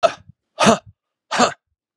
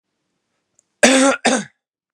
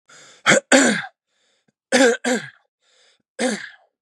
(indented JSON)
{
  "exhalation_length": "2.0 s",
  "exhalation_amplitude": 32237,
  "exhalation_signal_mean_std_ratio": 0.36,
  "cough_length": "2.1 s",
  "cough_amplitude": 32768,
  "cough_signal_mean_std_ratio": 0.39,
  "three_cough_length": "4.0 s",
  "three_cough_amplitude": 32503,
  "three_cough_signal_mean_std_ratio": 0.4,
  "survey_phase": "beta (2021-08-13 to 2022-03-07)",
  "age": "18-44",
  "gender": "Male",
  "wearing_mask": "No",
  "symptom_shortness_of_breath": true,
  "symptom_sore_throat": true,
  "symptom_abdominal_pain": true,
  "symptom_fatigue": true,
  "symptom_headache": true,
  "smoker_status": "Never smoked",
  "respiratory_condition_asthma": true,
  "respiratory_condition_other": false,
  "recruitment_source": "Test and Trace",
  "submission_delay": "1 day",
  "covid_test_result": "Positive",
  "covid_test_method": "RT-qPCR",
  "covid_ct_value": 23.7,
  "covid_ct_gene": "ORF1ab gene",
  "covid_ct_mean": 24.0,
  "covid_viral_load": "13000 copies/ml",
  "covid_viral_load_category": "Low viral load (10K-1M copies/ml)"
}